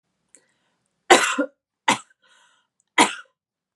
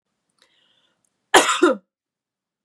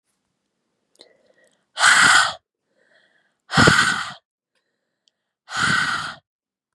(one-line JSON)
{"three_cough_length": "3.8 s", "three_cough_amplitude": 32767, "three_cough_signal_mean_std_ratio": 0.26, "cough_length": "2.6 s", "cough_amplitude": 32767, "cough_signal_mean_std_ratio": 0.27, "exhalation_length": "6.7 s", "exhalation_amplitude": 32768, "exhalation_signal_mean_std_ratio": 0.38, "survey_phase": "beta (2021-08-13 to 2022-03-07)", "age": "18-44", "gender": "Female", "wearing_mask": "No", "symptom_shortness_of_breath": true, "smoker_status": "Never smoked", "respiratory_condition_asthma": false, "respiratory_condition_other": false, "recruitment_source": "Test and Trace", "submission_delay": "2 days", "covid_test_result": "Positive", "covid_test_method": "LFT"}